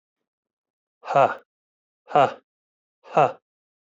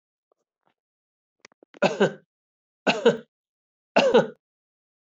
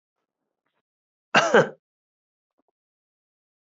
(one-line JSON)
{"exhalation_length": "3.9 s", "exhalation_amplitude": 18265, "exhalation_signal_mean_std_ratio": 0.28, "three_cough_length": "5.1 s", "three_cough_amplitude": 17539, "three_cough_signal_mean_std_ratio": 0.29, "cough_length": "3.7 s", "cough_amplitude": 19575, "cough_signal_mean_std_ratio": 0.21, "survey_phase": "beta (2021-08-13 to 2022-03-07)", "age": "45-64", "gender": "Male", "wearing_mask": "No", "symptom_none": true, "smoker_status": "Ex-smoker", "respiratory_condition_asthma": false, "respiratory_condition_other": false, "recruitment_source": "REACT", "submission_delay": "1 day", "covid_test_result": "Negative", "covid_test_method": "RT-qPCR"}